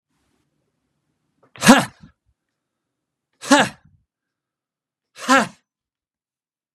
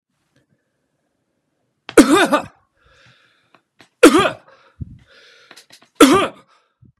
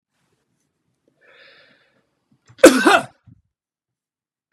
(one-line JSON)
{"exhalation_length": "6.7 s", "exhalation_amplitude": 32768, "exhalation_signal_mean_std_ratio": 0.21, "three_cough_length": "7.0 s", "three_cough_amplitude": 32768, "three_cough_signal_mean_std_ratio": 0.28, "cough_length": "4.5 s", "cough_amplitude": 32768, "cough_signal_mean_std_ratio": 0.2, "survey_phase": "beta (2021-08-13 to 2022-03-07)", "age": "45-64", "gender": "Male", "wearing_mask": "No", "symptom_none": true, "smoker_status": "Never smoked", "respiratory_condition_asthma": false, "respiratory_condition_other": false, "recruitment_source": "REACT", "submission_delay": "2 days", "covid_test_result": "Negative", "covid_test_method": "RT-qPCR"}